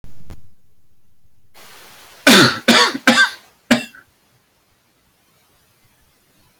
{"cough_length": "6.6 s", "cough_amplitude": 31494, "cough_signal_mean_std_ratio": 0.35, "survey_phase": "beta (2021-08-13 to 2022-03-07)", "age": "65+", "gender": "Male", "wearing_mask": "No", "symptom_none": true, "smoker_status": "Ex-smoker", "respiratory_condition_asthma": false, "respiratory_condition_other": false, "recruitment_source": "REACT", "submission_delay": "2 days", "covid_test_result": "Negative", "covid_test_method": "RT-qPCR"}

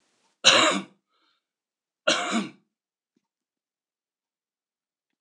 {"cough_length": "5.2 s", "cough_amplitude": 25454, "cough_signal_mean_std_ratio": 0.27, "survey_phase": "alpha (2021-03-01 to 2021-08-12)", "age": "45-64", "gender": "Male", "wearing_mask": "No", "symptom_none": true, "smoker_status": "Ex-smoker", "respiratory_condition_asthma": false, "respiratory_condition_other": false, "recruitment_source": "REACT", "submission_delay": "2 days", "covid_test_result": "Negative", "covid_test_method": "RT-qPCR"}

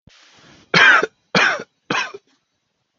{"three_cough_length": "3.0 s", "three_cough_amplitude": 32768, "three_cough_signal_mean_std_ratio": 0.39, "survey_phase": "beta (2021-08-13 to 2022-03-07)", "age": "18-44", "gender": "Male", "wearing_mask": "No", "symptom_none": true, "symptom_onset": "10 days", "smoker_status": "Never smoked", "respiratory_condition_asthma": true, "respiratory_condition_other": false, "recruitment_source": "REACT", "submission_delay": "2 days", "covid_test_result": "Negative", "covid_test_method": "RT-qPCR", "influenza_a_test_result": "Negative", "influenza_b_test_result": "Negative"}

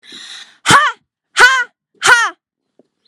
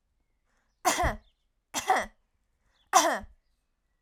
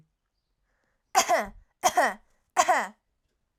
{"exhalation_length": "3.1 s", "exhalation_amplitude": 32768, "exhalation_signal_mean_std_ratio": 0.42, "three_cough_length": "4.0 s", "three_cough_amplitude": 16304, "three_cough_signal_mean_std_ratio": 0.34, "cough_length": "3.6 s", "cough_amplitude": 16651, "cough_signal_mean_std_ratio": 0.37, "survey_phase": "alpha (2021-03-01 to 2021-08-12)", "age": "18-44", "gender": "Female", "wearing_mask": "No", "symptom_none": true, "smoker_status": "Never smoked", "respiratory_condition_asthma": false, "respiratory_condition_other": false, "recruitment_source": "REACT", "submission_delay": "3 days", "covid_test_result": "Negative", "covid_test_method": "RT-qPCR"}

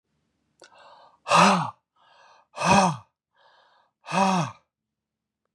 {"exhalation_length": "5.5 s", "exhalation_amplitude": 21270, "exhalation_signal_mean_std_ratio": 0.36, "survey_phase": "beta (2021-08-13 to 2022-03-07)", "age": "45-64", "gender": "Male", "wearing_mask": "No", "symptom_none": true, "smoker_status": "Never smoked", "respiratory_condition_asthma": false, "respiratory_condition_other": false, "recruitment_source": "REACT", "submission_delay": "1 day", "covid_test_result": "Negative", "covid_test_method": "RT-qPCR", "influenza_a_test_result": "Negative", "influenza_b_test_result": "Negative"}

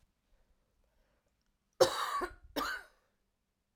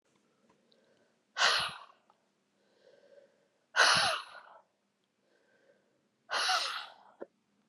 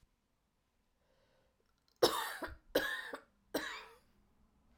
{"cough_length": "3.8 s", "cough_amplitude": 8342, "cough_signal_mean_std_ratio": 0.29, "exhalation_length": "7.7 s", "exhalation_amplitude": 10111, "exhalation_signal_mean_std_ratio": 0.33, "three_cough_length": "4.8 s", "three_cough_amplitude": 6029, "three_cough_signal_mean_std_ratio": 0.32, "survey_phase": "alpha (2021-03-01 to 2021-08-12)", "age": "18-44", "gender": "Female", "wearing_mask": "No", "symptom_cough_any": true, "symptom_shortness_of_breath": true, "symptom_diarrhoea": true, "symptom_fatigue": true, "symptom_fever_high_temperature": true, "symptom_headache": true, "symptom_change_to_sense_of_smell_or_taste": true, "symptom_onset": "4 days", "smoker_status": "Never smoked", "respiratory_condition_asthma": true, "respiratory_condition_other": false, "recruitment_source": "Test and Trace", "submission_delay": "2 days", "covid_test_result": "Positive", "covid_test_method": "RT-qPCR", "covid_ct_value": 17.2, "covid_ct_gene": "ORF1ab gene"}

